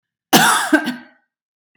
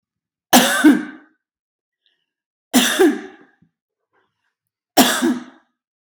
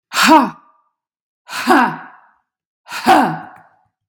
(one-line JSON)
{"cough_length": "1.8 s", "cough_amplitude": 32768, "cough_signal_mean_std_ratio": 0.44, "three_cough_length": "6.1 s", "three_cough_amplitude": 32768, "three_cough_signal_mean_std_ratio": 0.36, "exhalation_length": "4.1 s", "exhalation_amplitude": 32768, "exhalation_signal_mean_std_ratio": 0.42, "survey_phase": "beta (2021-08-13 to 2022-03-07)", "age": "45-64", "gender": "Female", "wearing_mask": "No", "symptom_cough_any": true, "symptom_fatigue": true, "symptom_other": true, "symptom_onset": "10 days", "smoker_status": "Never smoked", "respiratory_condition_asthma": true, "respiratory_condition_other": false, "recruitment_source": "REACT", "submission_delay": "17 days", "covid_test_result": "Negative", "covid_test_method": "RT-qPCR"}